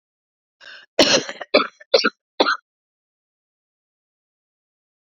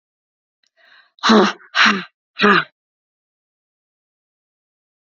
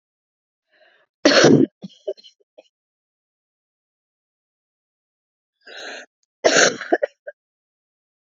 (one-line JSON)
{"cough_length": "5.1 s", "cough_amplitude": 29217, "cough_signal_mean_std_ratio": 0.27, "exhalation_length": "5.1 s", "exhalation_amplitude": 27821, "exhalation_signal_mean_std_ratio": 0.31, "three_cough_length": "8.4 s", "three_cough_amplitude": 29844, "three_cough_signal_mean_std_ratio": 0.25, "survey_phase": "alpha (2021-03-01 to 2021-08-12)", "age": "18-44", "gender": "Female", "wearing_mask": "No", "symptom_cough_any": true, "symptom_fatigue": true, "symptom_fever_high_temperature": true, "symptom_headache": true, "symptom_onset": "3 days", "smoker_status": "Ex-smoker", "respiratory_condition_asthma": false, "respiratory_condition_other": false, "recruitment_source": "Test and Trace", "submission_delay": "2 days", "covid_test_result": "Positive", "covid_test_method": "RT-qPCR"}